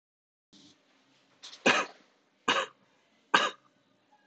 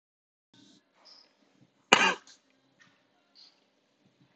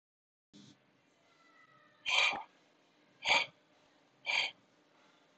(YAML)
three_cough_length: 4.3 s
three_cough_amplitude: 15311
three_cough_signal_mean_std_ratio: 0.27
cough_length: 4.4 s
cough_amplitude: 26027
cough_signal_mean_std_ratio: 0.17
exhalation_length: 5.4 s
exhalation_amplitude: 5685
exhalation_signal_mean_std_ratio: 0.32
survey_phase: beta (2021-08-13 to 2022-03-07)
age: 18-44
gender: Male
wearing_mask: 'No'
symptom_runny_or_blocked_nose: true
symptom_sore_throat: true
symptom_onset: 11 days
smoker_status: Never smoked
respiratory_condition_asthma: false
respiratory_condition_other: false
recruitment_source: REACT
submission_delay: 0 days
covid_test_result: Negative
covid_test_method: RT-qPCR